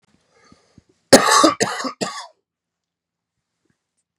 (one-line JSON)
{"cough_length": "4.2 s", "cough_amplitude": 32768, "cough_signal_mean_std_ratio": 0.29, "survey_phase": "beta (2021-08-13 to 2022-03-07)", "age": "18-44", "gender": "Male", "wearing_mask": "No", "symptom_cough_any": true, "symptom_runny_or_blocked_nose": true, "symptom_shortness_of_breath": true, "symptom_fatigue": true, "symptom_fever_high_temperature": true, "symptom_change_to_sense_of_smell_or_taste": true, "smoker_status": "Never smoked", "respiratory_condition_asthma": true, "respiratory_condition_other": false, "recruitment_source": "Test and Trace", "submission_delay": "2 days", "covid_test_result": "Positive", "covid_test_method": "LFT"}